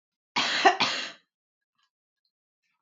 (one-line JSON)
{"cough_length": "2.8 s", "cough_amplitude": 17854, "cough_signal_mean_std_ratio": 0.34, "survey_phase": "alpha (2021-03-01 to 2021-08-12)", "age": "18-44", "gender": "Female", "wearing_mask": "No", "symptom_none": true, "smoker_status": "Never smoked", "respiratory_condition_asthma": false, "respiratory_condition_other": false, "recruitment_source": "REACT", "submission_delay": "1 day", "covid_test_result": "Negative", "covid_test_method": "RT-qPCR"}